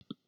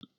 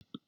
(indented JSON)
{
  "exhalation_length": "0.3 s",
  "exhalation_amplitude": 1188,
  "exhalation_signal_mean_std_ratio": 0.26,
  "three_cough_length": "0.2 s",
  "three_cough_amplitude": 583,
  "three_cough_signal_mean_std_ratio": 0.38,
  "cough_length": "0.3 s",
  "cough_amplitude": 1026,
  "cough_signal_mean_std_ratio": 0.28,
  "survey_phase": "beta (2021-08-13 to 2022-03-07)",
  "age": "45-64",
  "gender": "Female",
  "wearing_mask": "No",
  "symptom_none": true,
  "smoker_status": "Never smoked",
  "respiratory_condition_asthma": false,
  "respiratory_condition_other": false,
  "recruitment_source": "REACT",
  "submission_delay": "4 days",
  "covid_test_result": "Negative",
  "covid_test_method": "RT-qPCR",
  "influenza_a_test_result": "Negative",
  "influenza_b_test_result": "Negative"
}